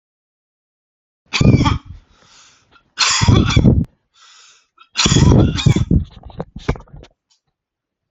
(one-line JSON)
{"three_cough_length": "8.1 s", "three_cough_amplitude": 29052, "three_cough_signal_mean_std_ratio": 0.43, "survey_phase": "alpha (2021-03-01 to 2021-08-12)", "age": "18-44", "gender": "Male", "wearing_mask": "No", "symptom_none": true, "smoker_status": "Ex-smoker", "respiratory_condition_asthma": false, "respiratory_condition_other": false, "recruitment_source": "REACT", "submission_delay": "2 days", "covid_test_result": "Negative", "covid_test_method": "RT-qPCR"}